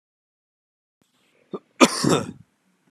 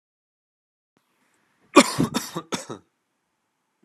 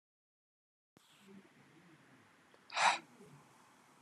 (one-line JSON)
{"cough_length": "2.9 s", "cough_amplitude": 31091, "cough_signal_mean_std_ratio": 0.25, "three_cough_length": "3.8 s", "three_cough_amplitude": 32768, "three_cough_signal_mean_std_ratio": 0.21, "exhalation_length": "4.0 s", "exhalation_amplitude": 4630, "exhalation_signal_mean_std_ratio": 0.23, "survey_phase": "beta (2021-08-13 to 2022-03-07)", "age": "18-44", "gender": "Male", "wearing_mask": "No", "symptom_none": true, "smoker_status": "Never smoked", "respiratory_condition_asthma": false, "respiratory_condition_other": false, "recruitment_source": "REACT", "submission_delay": "3 days", "covid_test_result": "Negative", "covid_test_method": "RT-qPCR", "influenza_a_test_result": "Negative", "influenza_b_test_result": "Negative"}